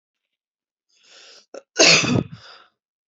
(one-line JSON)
{"cough_length": "3.1 s", "cough_amplitude": 29985, "cough_signal_mean_std_ratio": 0.31, "survey_phase": "beta (2021-08-13 to 2022-03-07)", "age": "18-44", "gender": "Female", "wearing_mask": "No", "symptom_cough_any": true, "symptom_fatigue": true, "symptom_headache": true, "symptom_change_to_sense_of_smell_or_taste": true, "symptom_onset": "3 days", "smoker_status": "Current smoker (e-cigarettes or vapes only)", "respiratory_condition_asthma": false, "respiratory_condition_other": false, "recruitment_source": "Test and Trace", "submission_delay": "2 days", "covid_test_result": "Positive", "covid_test_method": "RT-qPCR", "covid_ct_value": 18.0, "covid_ct_gene": "ORF1ab gene", "covid_ct_mean": 18.7, "covid_viral_load": "750000 copies/ml", "covid_viral_load_category": "Low viral load (10K-1M copies/ml)"}